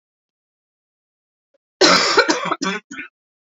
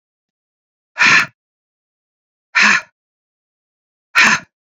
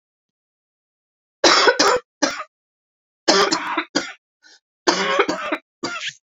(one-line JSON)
{"cough_length": "3.4 s", "cough_amplitude": 29540, "cough_signal_mean_std_ratio": 0.38, "exhalation_length": "4.8 s", "exhalation_amplitude": 31138, "exhalation_signal_mean_std_ratio": 0.32, "three_cough_length": "6.4 s", "three_cough_amplitude": 31284, "three_cough_signal_mean_std_ratio": 0.43, "survey_phase": "beta (2021-08-13 to 2022-03-07)", "age": "45-64", "gender": "Female", "wearing_mask": "No", "symptom_cough_any": true, "symptom_runny_or_blocked_nose": true, "symptom_sore_throat": true, "symptom_fatigue": true, "symptom_fever_high_temperature": true, "symptom_onset": "2 days", "smoker_status": "Never smoked", "respiratory_condition_asthma": false, "respiratory_condition_other": false, "recruitment_source": "Test and Trace", "submission_delay": "2 days", "covid_test_result": "Positive", "covid_test_method": "RT-qPCR", "covid_ct_value": 14.9, "covid_ct_gene": "ORF1ab gene", "covid_ct_mean": 15.2, "covid_viral_load": "10000000 copies/ml", "covid_viral_load_category": "High viral load (>1M copies/ml)"}